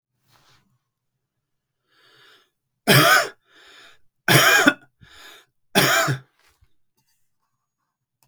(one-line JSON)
{"three_cough_length": "8.3 s", "three_cough_amplitude": 32766, "three_cough_signal_mean_std_ratio": 0.32, "survey_phase": "beta (2021-08-13 to 2022-03-07)", "age": "45-64", "gender": "Male", "wearing_mask": "No", "symptom_none": true, "smoker_status": "Never smoked", "respiratory_condition_asthma": false, "respiratory_condition_other": false, "recruitment_source": "REACT", "submission_delay": "3 days", "covid_test_result": "Negative", "covid_test_method": "RT-qPCR", "influenza_a_test_result": "Negative", "influenza_b_test_result": "Negative"}